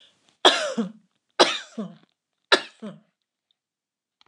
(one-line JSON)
{"three_cough_length": "4.3 s", "three_cough_amplitude": 29203, "three_cough_signal_mean_std_ratio": 0.28, "survey_phase": "beta (2021-08-13 to 2022-03-07)", "age": "65+", "gender": "Female", "wearing_mask": "No", "symptom_none": true, "smoker_status": "Never smoked", "respiratory_condition_asthma": false, "respiratory_condition_other": false, "recruitment_source": "REACT", "submission_delay": "2 days", "covid_test_result": "Negative", "covid_test_method": "RT-qPCR", "influenza_a_test_result": "Negative", "influenza_b_test_result": "Negative"}